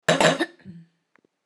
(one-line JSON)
{"cough_length": "1.5 s", "cough_amplitude": 25566, "cough_signal_mean_std_ratio": 0.39, "survey_phase": "alpha (2021-03-01 to 2021-08-12)", "age": "45-64", "gender": "Female", "wearing_mask": "No", "symptom_none": true, "smoker_status": "Current smoker (11 or more cigarettes per day)", "respiratory_condition_asthma": false, "respiratory_condition_other": false, "recruitment_source": "REACT", "submission_delay": "1 day", "covid_test_result": "Negative", "covid_test_method": "RT-qPCR"}